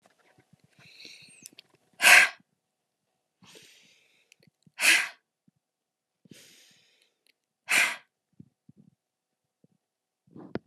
{
  "exhalation_length": "10.7 s",
  "exhalation_amplitude": 23108,
  "exhalation_signal_mean_std_ratio": 0.21,
  "survey_phase": "alpha (2021-03-01 to 2021-08-12)",
  "age": "45-64",
  "gender": "Female",
  "wearing_mask": "No",
  "symptom_none": true,
  "smoker_status": "Never smoked",
  "respiratory_condition_asthma": false,
  "respiratory_condition_other": false,
  "recruitment_source": "REACT",
  "submission_delay": "2 days",
  "covid_test_result": "Negative",
  "covid_test_method": "RT-qPCR"
}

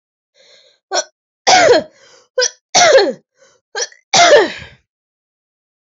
{
  "three_cough_length": "5.9 s",
  "three_cough_amplitude": 32768,
  "three_cough_signal_mean_std_ratio": 0.42,
  "survey_phase": "alpha (2021-03-01 to 2021-08-12)",
  "age": "18-44",
  "gender": "Female",
  "wearing_mask": "No",
  "symptom_cough_any": true,
  "symptom_new_continuous_cough": true,
  "symptom_shortness_of_breath": true,
  "symptom_abdominal_pain": true,
  "symptom_fatigue": true,
  "symptom_fever_high_temperature": true,
  "symptom_headache": true,
  "symptom_change_to_sense_of_smell_or_taste": true,
  "symptom_loss_of_taste": true,
  "smoker_status": "Never smoked",
  "respiratory_condition_asthma": false,
  "respiratory_condition_other": false,
  "recruitment_source": "Test and Trace",
  "submission_delay": "1 day",
  "covid_test_result": "Positive",
  "covid_test_method": "RT-qPCR",
  "covid_ct_value": 21.6,
  "covid_ct_gene": "ORF1ab gene",
  "covid_ct_mean": 23.5,
  "covid_viral_load": "20000 copies/ml",
  "covid_viral_load_category": "Low viral load (10K-1M copies/ml)"
}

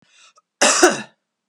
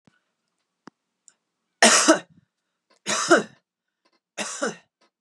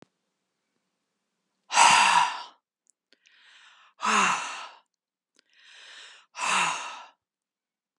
{
  "cough_length": "1.5 s",
  "cough_amplitude": 32768,
  "cough_signal_mean_std_ratio": 0.38,
  "three_cough_length": "5.2 s",
  "three_cough_amplitude": 29581,
  "three_cough_signal_mean_std_ratio": 0.29,
  "exhalation_length": "8.0 s",
  "exhalation_amplitude": 19010,
  "exhalation_signal_mean_std_ratio": 0.35,
  "survey_phase": "beta (2021-08-13 to 2022-03-07)",
  "age": "45-64",
  "gender": "Female",
  "wearing_mask": "No",
  "symptom_none": true,
  "smoker_status": "Never smoked",
  "respiratory_condition_asthma": false,
  "respiratory_condition_other": false,
  "recruitment_source": "REACT",
  "submission_delay": "1 day",
  "covid_test_result": "Negative",
  "covid_test_method": "RT-qPCR",
  "influenza_a_test_result": "Negative",
  "influenza_b_test_result": "Negative"
}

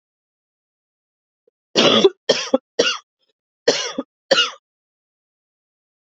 {
  "three_cough_length": "6.1 s",
  "three_cough_amplitude": 32742,
  "three_cough_signal_mean_std_ratio": 0.31,
  "survey_phase": "beta (2021-08-13 to 2022-03-07)",
  "age": "18-44",
  "gender": "Female",
  "wearing_mask": "No",
  "symptom_cough_any": true,
  "symptom_runny_or_blocked_nose": true,
  "symptom_sore_throat": true,
  "symptom_fatigue": true,
  "symptom_fever_high_temperature": true,
  "symptom_headache": true,
  "symptom_onset": "3 days",
  "smoker_status": "Never smoked",
  "respiratory_condition_asthma": false,
  "respiratory_condition_other": false,
  "recruitment_source": "Test and Trace",
  "submission_delay": "1 day",
  "covid_test_result": "Positive",
  "covid_test_method": "RT-qPCR",
  "covid_ct_value": 23.0,
  "covid_ct_gene": "ORF1ab gene"
}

